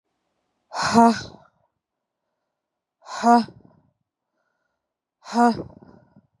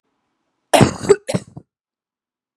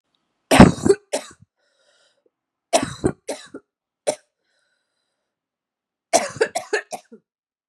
{"exhalation_length": "6.4 s", "exhalation_amplitude": 28293, "exhalation_signal_mean_std_ratio": 0.28, "cough_length": "2.6 s", "cough_amplitude": 32768, "cough_signal_mean_std_ratio": 0.27, "three_cough_length": "7.7 s", "three_cough_amplitude": 32768, "three_cough_signal_mean_std_ratio": 0.24, "survey_phase": "beta (2021-08-13 to 2022-03-07)", "age": "18-44", "gender": "Female", "wearing_mask": "No", "symptom_cough_any": true, "symptom_runny_or_blocked_nose": true, "symptom_shortness_of_breath": true, "symptom_sore_throat": true, "symptom_fatigue": true, "symptom_headache": true, "symptom_change_to_sense_of_smell_or_taste": true, "symptom_onset": "3 days", "smoker_status": "Current smoker (11 or more cigarettes per day)", "respiratory_condition_asthma": false, "respiratory_condition_other": false, "recruitment_source": "Test and Trace", "submission_delay": "1 day", "covid_test_result": "Positive", "covid_test_method": "RT-qPCR"}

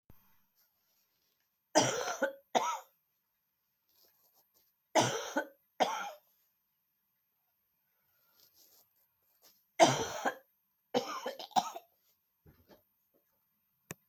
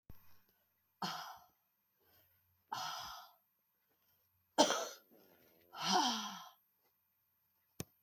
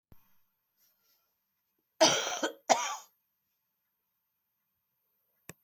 {"three_cough_length": "14.1 s", "three_cough_amplitude": 11716, "three_cough_signal_mean_std_ratio": 0.28, "exhalation_length": "8.0 s", "exhalation_amplitude": 6164, "exhalation_signal_mean_std_ratio": 0.32, "cough_length": "5.6 s", "cough_amplitude": 13012, "cough_signal_mean_std_ratio": 0.24, "survey_phase": "beta (2021-08-13 to 2022-03-07)", "age": "65+", "gender": "Female", "wearing_mask": "No", "symptom_runny_or_blocked_nose": true, "symptom_fatigue": true, "symptom_headache": true, "symptom_onset": "3 days", "smoker_status": "Never smoked", "respiratory_condition_asthma": false, "respiratory_condition_other": false, "recruitment_source": "Test and Trace", "submission_delay": "2 days", "covid_test_result": "Positive", "covid_test_method": "RT-qPCR", "covid_ct_value": 14.8, "covid_ct_gene": "ORF1ab gene", "covid_ct_mean": 15.1, "covid_viral_load": "11000000 copies/ml", "covid_viral_load_category": "High viral load (>1M copies/ml)"}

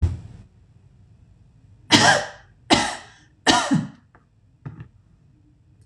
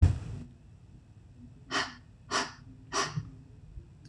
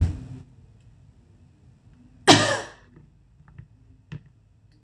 {"three_cough_length": "5.9 s", "three_cough_amplitude": 26028, "three_cough_signal_mean_std_ratio": 0.35, "exhalation_length": "4.1 s", "exhalation_amplitude": 9470, "exhalation_signal_mean_std_ratio": 0.4, "cough_length": "4.8 s", "cough_amplitude": 26027, "cough_signal_mean_std_ratio": 0.26, "survey_phase": "beta (2021-08-13 to 2022-03-07)", "age": "45-64", "gender": "Female", "wearing_mask": "No", "symptom_cough_any": true, "symptom_change_to_sense_of_smell_or_taste": true, "symptom_loss_of_taste": true, "symptom_onset": "12 days", "smoker_status": "Ex-smoker", "respiratory_condition_asthma": false, "respiratory_condition_other": false, "recruitment_source": "REACT", "submission_delay": "2 days", "covid_test_result": "Negative", "covid_test_method": "RT-qPCR", "influenza_a_test_result": "Negative", "influenza_b_test_result": "Negative"}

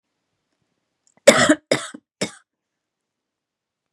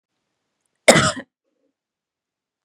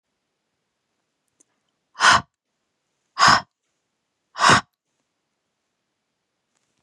{"three_cough_length": "3.9 s", "three_cough_amplitude": 32768, "three_cough_signal_mean_std_ratio": 0.22, "cough_length": "2.6 s", "cough_amplitude": 32768, "cough_signal_mean_std_ratio": 0.22, "exhalation_length": "6.8 s", "exhalation_amplitude": 29722, "exhalation_signal_mean_std_ratio": 0.23, "survey_phase": "beta (2021-08-13 to 2022-03-07)", "age": "18-44", "gender": "Female", "wearing_mask": "No", "symptom_runny_or_blocked_nose": true, "smoker_status": "Never smoked", "respiratory_condition_asthma": false, "respiratory_condition_other": false, "recruitment_source": "REACT", "submission_delay": "6 days", "covid_test_result": "Negative", "covid_test_method": "RT-qPCR", "influenza_a_test_result": "Negative", "influenza_b_test_result": "Negative"}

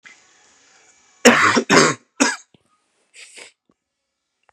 {"three_cough_length": "4.5 s", "three_cough_amplitude": 32768, "three_cough_signal_mean_std_ratio": 0.32, "survey_phase": "beta (2021-08-13 to 2022-03-07)", "age": "45-64", "gender": "Male", "wearing_mask": "No", "symptom_cough_any": true, "symptom_runny_or_blocked_nose": true, "symptom_sore_throat": true, "symptom_headache": true, "smoker_status": "Never smoked", "respiratory_condition_asthma": false, "respiratory_condition_other": false, "recruitment_source": "Test and Trace", "submission_delay": "1 day", "covid_test_result": "Positive", "covid_test_method": "RT-qPCR", "covid_ct_value": 18.1, "covid_ct_gene": "ORF1ab gene", "covid_ct_mean": 18.6, "covid_viral_load": "810000 copies/ml", "covid_viral_load_category": "Low viral load (10K-1M copies/ml)"}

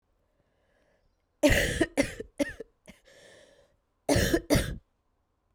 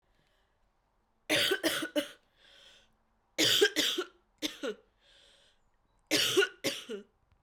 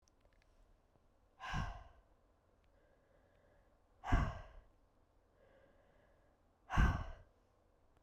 {"cough_length": "5.5 s", "cough_amplitude": 11344, "cough_signal_mean_std_ratio": 0.36, "three_cough_length": "7.4 s", "three_cough_amplitude": 8840, "three_cough_signal_mean_std_ratio": 0.42, "exhalation_length": "8.0 s", "exhalation_amplitude": 3964, "exhalation_signal_mean_std_ratio": 0.28, "survey_phase": "beta (2021-08-13 to 2022-03-07)", "age": "18-44", "gender": "Female", "wearing_mask": "No", "symptom_cough_any": true, "symptom_shortness_of_breath": true, "symptom_fatigue": true, "symptom_fever_high_temperature": true, "symptom_other": true, "smoker_status": "Never smoked", "respiratory_condition_asthma": false, "respiratory_condition_other": false, "recruitment_source": "Test and Trace", "submission_delay": "2 days", "covid_test_result": "Positive", "covid_test_method": "RT-qPCR", "covid_ct_value": 28.9, "covid_ct_gene": "ORF1ab gene"}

